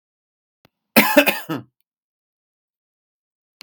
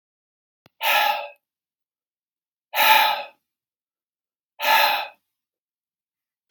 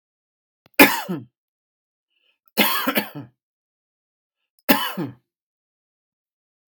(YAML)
cough_length: 3.6 s
cough_amplitude: 32768
cough_signal_mean_std_ratio: 0.25
exhalation_length: 6.5 s
exhalation_amplitude: 26601
exhalation_signal_mean_std_ratio: 0.35
three_cough_length: 6.7 s
three_cough_amplitude: 32768
three_cough_signal_mean_std_ratio: 0.26
survey_phase: beta (2021-08-13 to 2022-03-07)
age: 18-44
gender: Male
wearing_mask: 'No'
symptom_none: true
smoker_status: Never smoked
respiratory_condition_asthma: false
respiratory_condition_other: false
recruitment_source: REACT
submission_delay: 0 days
covid_test_result: Negative
covid_test_method: RT-qPCR
influenza_a_test_result: Negative
influenza_b_test_result: Negative